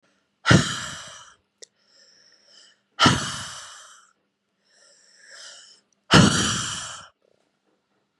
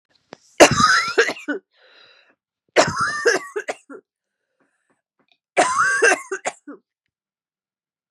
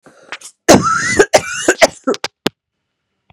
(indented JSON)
{
  "exhalation_length": "8.2 s",
  "exhalation_amplitude": 32088,
  "exhalation_signal_mean_std_ratio": 0.31,
  "three_cough_length": "8.1 s",
  "three_cough_amplitude": 32768,
  "three_cough_signal_mean_std_ratio": 0.38,
  "cough_length": "3.3 s",
  "cough_amplitude": 32768,
  "cough_signal_mean_std_ratio": 0.41,
  "survey_phase": "beta (2021-08-13 to 2022-03-07)",
  "age": "18-44",
  "gender": "Female",
  "wearing_mask": "No",
  "symptom_cough_any": true,
  "symptom_runny_or_blocked_nose": true,
  "symptom_sore_throat": true,
  "symptom_fatigue": true,
  "symptom_change_to_sense_of_smell_or_taste": true,
  "symptom_onset": "2 days",
  "smoker_status": "Never smoked",
  "respiratory_condition_asthma": true,
  "respiratory_condition_other": false,
  "recruitment_source": "Test and Trace",
  "submission_delay": "1 day",
  "covid_test_result": "Positive",
  "covid_test_method": "ePCR"
}